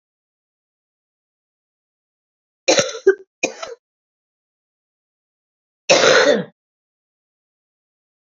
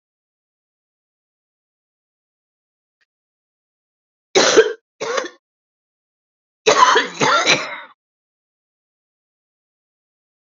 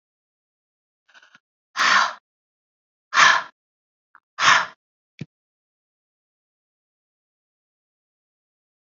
{"cough_length": "8.4 s", "cough_amplitude": 29561, "cough_signal_mean_std_ratio": 0.26, "three_cough_length": "10.6 s", "three_cough_amplitude": 32767, "three_cough_signal_mean_std_ratio": 0.28, "exhalation_length": "8.9 s", "exhalation_amplitude": 28921, "exhalation_signal_mean_std_ratio": 0.24, "survey_phase": "beta (2021-08-13 to 2022-03-07)", "age": "45-64", "gender": "Female", "wearing_mask": "No", "symptom_cough_any": true, "symptom_runny_or_blocked_nose": true, "symptom_sore_throat": true, "symptom_fatigue": true, "symptom_fever_high_temperature": true, "symptom_headache": true, "symptom_onset": "4 days", "smoker_status": "Ex-smoker", "respiratory_condition_asthma": false, "respiratory_condition_other": false, "recruitment_source": "Test and Trace", "submission_delay": "2 days", "covid_test_result": "Positive", "covid_test_method": "RT-qPCR", "covid_ct_value": 17.1, "covid_ct_gene": "ORF1ab gene", "covid_ct_mean": 17.3, "covid_viral_load": "2100000 copies/ml", "covid_viral_load_category": "High viral load (>1M copies/ml)"}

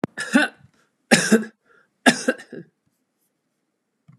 {"three_cough_length": "4.2 s", "three_cough_amplitude": 32410, "three_cough_signal_mean_std_ratio": 0.31, "survey_phase": "beta (2021-08-13 to 2022-03-07)", "age": "65+", "gender": "Female", "wearing_mask": "No", "symptom_none": true, "smoker_status": "Never smoked", "respiratory_condition_asthma": false, "respiratory_condition_other": false, "recruitment_source": "REACT", "submission_delay": "4 days", "covid_test_result": "Negative", "covid_test_method": "RT-qPCR"}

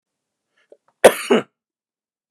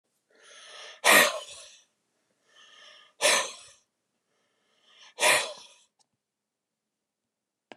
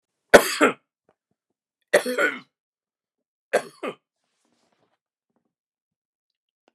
{"cough_length": "2.3 s", "cough_amplitude": 32768, "cough_signal_mean_std_ratio": 0.22, "exhalation_length": "7.8 s", "exhalation_amplitude": 18115, "exhalation_signal_mean_std_ratio": 0.27, "three_cough_length": "6.7 s", "three_cough_amplitude": 32768, "three_cough_signal_mean_std_ratio": 0.21, "survey_phase": "beta (2021-08-13 to 2022-03-07)", "age": "18-44", "gender": "Male", "wearing_mask": "No", "symptom_none": true, "smoker_status": "Never smoked", "respiratory_condition_asthma": true, "respiratory_condition_other": false, "recruitment_source": "REACT", "submission_delay": "2 days", "covid_test_result": "Negative", "covid_test_method": "RT-qPCR", "influenza_a_test_result": "Negative", "influenza_b_test_result": "Negative"}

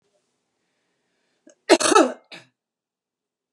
{"cough_length": "3.5 s", "cough_amplitude": 29858, "cough_signal_mean_std_ratio": 0.24, "survey_phase": "beta (2021-08-13 to 2022-03-07)", "age": "65+", "gender": "Female", "wearing_mask": "No", "symptom_none": true, "smoker_status": "Ex-smoker", "respiratory_condition_asthma": false, "respiratory_condition_other": false, "recruitment_source": "REACT", "submission_delay": "1 day", "covid_test_result": "Negative", "covid_test_method": "RT-qPCR", "influenza_a_test_result": "Negative", "influenza_b_test_result": "Negative"}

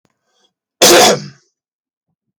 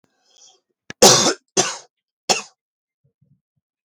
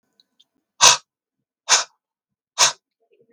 {"cough_length": "2.4 s", "cough_amplitude": 32768, "cough_signal_mean_std_ratio": 0.36, "three_cough_length": "3.8 s", "three_cough_amplitude": 32768, "three_cough_signal_mean_std_ratio": 0.28, "exhalation_length": "3.3 s", "exhalation_amplitude": 32768, "exhalation_signal_mean_std_ratio": 0.26, "survey_phase": "beta (2021-08-13 to 2022-03-07)", "age": "18-44", "gender": "Male", "wearing_mask": "No", "symptom_none": true, "smoker_status": "Never smoked", "respiratory_condition_asthma": false, "respiratory_condition_other": false, "recruitment_source": "REACT", "submission_delay": "3 days", "covid_test_result": "Negative", "covid_test_method": "RT-qPCR"}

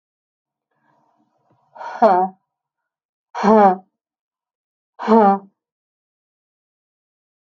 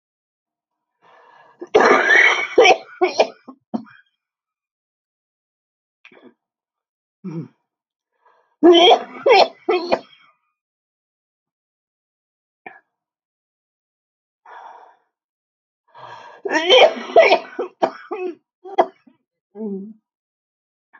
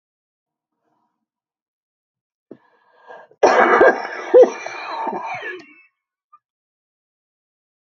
{"exhalation_length": "7.4 s", "exhalation_amplitude": 31629, "exhalation_signal_mean_std_ratio": 0.29, "three_cough_length": "21.0 s", "three_cough_amplitude": 32042, "three_cough_signal_mean_std_ratio": 0.31, "cough_length": "7.9 s", "cough_amplitude": 32767, "cough_signal_mean_std_ratio": 0.3, "survey_phase": "alpha (2021-03-01 to 2021-08-12)", "age": "45-64", "gender": "Female", "wearing_mask": "No", "symptom_cough_any": true, "symptom_shortness_of_breath": true, "symptom_diarrhoea": true, "symptom_fatigue": true, "symptom_headache": true, "symptom_onset": "4 days", "smoker_status": "Never smoked", "respiratory_condition_asthma": true, "respiratory_condition_other": false, "recruitment_source": "Test and Trace", "submission_delay": "2 days", "covid_test_result": "Positive", "covid_test_method": "RT-qPCR", "covid_ct_value": 12.0, "covid_ct_gene": "ORF1ab gene", "covid_ct_mean": 12.5, "covid_viral_load": "79000000 copies/ml", "covid_viral_load_category": "High viral load (>1M copies/ml)"}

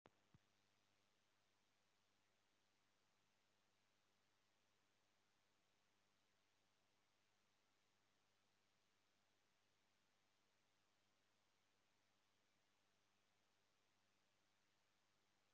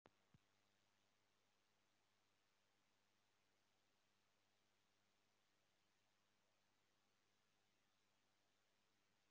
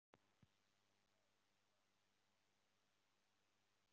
{"exhalation_length": "15.5 s", "exhalation_amplitude": 104, "exhalation_signal_mean_std_ratio": 0.9, "three_cough_length": "9.3 s", "three_cough_amplitude": 98, "three_cough_signal_mean_std_ratio": 0.86, "cough_length": "3.9 s", "cough_amplitude": 99, "cough_signal_mean_std_ratio": 0.74, "survey_phase": "alpha (2021-03-01 to 2021-08-12)", "age": "18-44", "gender": "Male", "wearing_mask": "No", "symptom_cough_any": true, "symptom_diarrhoea": true, "symptom_fatigue": true, "symptom_fever_high_temperature": true, "symptom_onset": "6 days", "smoker_status": "Never smoked", "respiratory_condition_asthma": false, "respiratory_condition_other": false, "recruitment_source": "Test and Trace", "submission_delay": "2 days", "covid_test_result": "Positive", "covid_test_method": "RT-qPCR"}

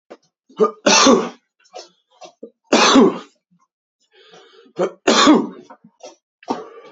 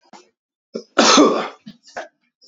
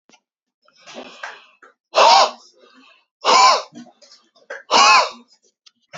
{"three_cough_length": "6.9 s", "three_cough_amplitude": 31635, "three_cough_signal_mean_std_ratio": 0.39, "cough_length": "2.5 s", "cough_amplitude": 30931, "cough_signal_mean_std_ratio": 0.38, "exhalation_length": "6.0 s", "exhalation_amplitude": 30624, "exhalation_signal_mean_std_ratio": 0.37, "survey_phase": "beta (2021-08-13 to 2022-03-07)", "age": "18-44", "gender": "Male", "wearing_mask": "No", "symptom_cough_any": true, "symptom_sore_throat": true, "symptom_fatigue": true, "symptom_headache": true, "smoker_status": "Ex-smoker", "respiratory_condition_asthma": false, "respiratory_condition_other": false, "recruitment_source": "Test and Trace", "submission_delay": "2 days", "covid_test_result": "Positive", "covid_test_method": "RT-qPCR", "covid_ct_value": 26.2, "covid_ct_gene": "ORF1ab gene", "covid_ct_mean": 26.5, "covid_viral_load": "2000 copies/ml", "covid_viral_load_category": "Minimal viral load (< 10K copies/ml)"}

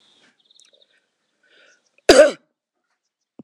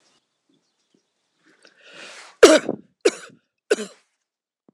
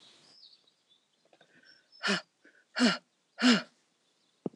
{"cough_length": "3.4 s", "cough_amplitude": 26028, "cough_signal_mean_std_ratio": 0.2, "three_cough_length": "4.7 s", "three_cough_amplitude": 26028, "three_cough_signal_mean_std_ratio": 0.21, "exhalation_length": "4.6 s", "exhalation_amplitude": 8905, "exhalation_signal_mean_std_ratio": 0.29, "survey_phase": "beta (2021-08-13 to 2022-03-07)", "age": "45-64", "gender": "Female", "wearing_mask": "No", "symptom_none": true, "smoker_status": "Never smoked", "respiratory_condition_asthma": false, "respiratory_condition_other": false, "recruitment_source": "REACT", "submission_delay": "0 days", "covid_test_result": "Negative", "covid_test_method": "RT-qPCR", "influenza_a_test_result": "Negative", "influenza_b_test_result": "Negative"}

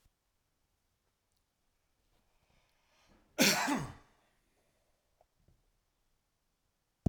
{"cough_length": "7.1 s", "cough_amplitude": 7674, "cough_signal_mean_std_ratio": 0.21, "survey_phase": "alpha (2021-03-01 to 2021-08-12)", "age": "65+", "gender": "Male", "wearing_mask": "No", "symptom_none": true, "smoker_status": "Never smoked", "respiratory_condition_asthma": false, "respiratory_condition_other": false, "recruitment_source": "REACT", "submission_delay": "3 days", "covid_test_result": "Negative", "covid_test_method": "RT-qPCR"}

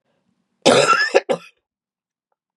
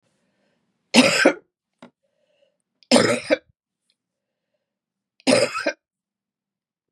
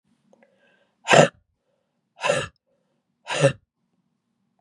{"cough_length": "2.6 s", "cough_amplitude": 32767, "cough_signal_mean_std_ratio": 0.37, "three_cough_length": "6.9 s", "three_cough_amplitude": 31110, "three_cough_signal_mean_std_ratio": 0.3, "exhalation_length": "4.6 s", "exhalation_amplitude": 31880, "exhalation_signal_mean_std_ratio": 0.25, "survey_phase": "beta (2021-08-13 to 2022-03-07)", "age": "45-64", "gender": "Female", "wearing_mask": "No", "symptom_cough_any": true, "symptom_runny_or_blocked_nose": true, "symptom_change_to_sense_of_smell_or_taste": true, "symptom_onset": "3 days", "smoker_status": "Never smoked", "respiratory_condition_asthma": false, "respiratory_condition_other": false, "recruitment_source": "Test and Trace", "submission_delay": "2 days", "covid_test_result": "Positive", "covid_test_method": "RT-qPCR", "covid_ct_value": 20.3, "covid_ct_gene": "ORF1ab gene", "covid_ct_mean": 20.8, "covid_viral_load": "150000 copies/ml", "covid_viral_load_category": "Low viral load (10K-1M copies/ml)"}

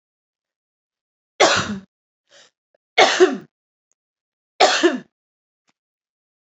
{"three_cough_length": "6.5 s", "three_cough_amplitude": 31656, "three_cough_signal_mean_std_ratio": 0.3, "survey_phase": "beta (2021-08-13 to 2022-03-07)", "age": "18-44", "gender": "Female", "wearing_mask": "No", "symptom_cough_any": true, "symptom_runny_or_blocked_nose": true, "symptom_fatigue": true, "symptom_onset": "2 days", "smoker_status": "Ex-smoker", "respiratory_condition_asthma": false, "respiratory_condition_other": false, "recruitment_source": "Test and Trace", "submission_delay": "2 days", "covid_test_result": "Positive", "covid_test_method": "RT-qPCR", "covid_ct_value": 17.9, "covid_ct_gene": "N gene", "covid_ct_mean": 18.8, "covid_viral_load": "690000 copies/ml", "covid_viral_load_category": "Low viral load (10K-1M copies/ml)"}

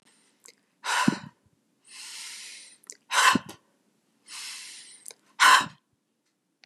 {"exhalation_length": "6.7 s", "exhalation_amplitude": 18783, "exhalation_signal_mean_std_ratio": 0.3, "survey_phase": "beta (2021-08-13 to 2022-03-07)", "age": "65+", "gender": "Female", "wearing_mask": "No", "symptom_abdominal_pain": true, "smoker_status": "Never smoked", "respiratory_condition_asthma": false, "respiratory_condition_other": false, "recruitment_source": "REACT", "submission_delay": "5 days", "covid_test_result": "Negative", "covid_test_method": "RT-qPCR", "influenza_a_test_result": "Negative", "influenza_b_test_result": "Negative"}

